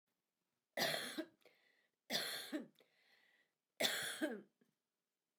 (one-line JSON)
{"three_cough_length": "5.4 s", "three_cough_amplitude": 2635, "three_cough_signal_mean_std_ratio": 0.42, "survey_phase": "beta (2021-08-13 to 2022-03-07)", "age": "45-64", "gender": "Female", "wearing_mask": "No", "symptom_none": true, "symptom_onset": "5 days", "smoker_status": "Ex-smoker", "respiratory_condition_asthma": false, "respiratory_condition_other": false, "recruitment_source": "REACT", "submission_delay": "2 days", "covid_test_result": "Negative", "covid_test_method": "RT-qPCR", "influenza_a_test_result": "Negative", "influenza_b_test_result": "Negative"}